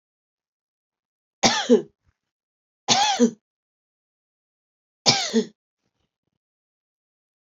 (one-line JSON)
{"three_cough_length": "7.4 s", "three_cough_amplitude": 25669, "three_cough_signal_mean_std_ratio": 0.28, "survey_phase": "beta (2021-08-13 to 2022-03-07)", "age": "45-64", "gender": "Female", "wearing_mask": "No", "symptom_runny_or_blocked_nose": true, "symptom_fatigue": true, "symptom_headache": true, "smoker_status": "Never smoked", "respiratory_condition_asthma": false, "respiratory_condition_other": false, "recruitment_source": "Test and Trace", "submission_delay": "1 day", "covid_test_result": "Positive", "covid_test_method": "ePCR"}